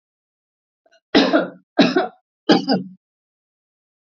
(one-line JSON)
{"three_cough_length": "4.0 s", "three_cough_amplitude": 27733, "three_cough_signal_mean_std_ratio": 0.36, "survey_phase": "beta (2021-08-13 to 2022-03-07)", "age": "65+", "gender": "Female", "wearing_mask": "No", "symptom_none": true, "smoker_status": "Ex-smoker", "respiratory_condition_asthma": false, "respiratory_condition_other": false, "recruitment_source": "REACT", "submission_delay": "2 days", "covid_test_result": "Negative", "covid_test_method": "RT-qPCR", "influenza_a_test_result": "Negative", "influenza_b_test_result": "Negative"}